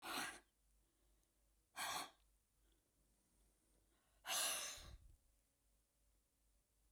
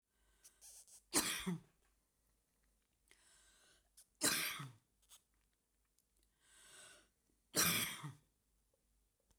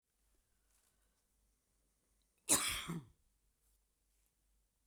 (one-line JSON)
{"exhalation_length": "6.9 s", "exhalation_amplitude": 1077, "exhalation_signal_mean_std_ratio": 0.37, "three_cough_length": "9.4 s", "three_cough_amplitude": 2990, "three_cough_signal_mean_std_ratio": 0.31, "cough_length": "4.9 s", "cough_amplitude": 6017, "cough_signal_mean_std_ratio": 0.23, "survey_phase": "beta (2021-08-13 to 2022-03-07)", "age": "65+", "gender": "Female", "wearing_mask": "No", "symptom_none": true, "smoker_status": "Never smoked", "respiratory_condition_asthma": false, "respiratory_condition_other": false, "recruitment_source": "REACT", "submission_delay": "1 day", "covid_test_result": "Negative", "covid_test_method": "RT-qPCR"}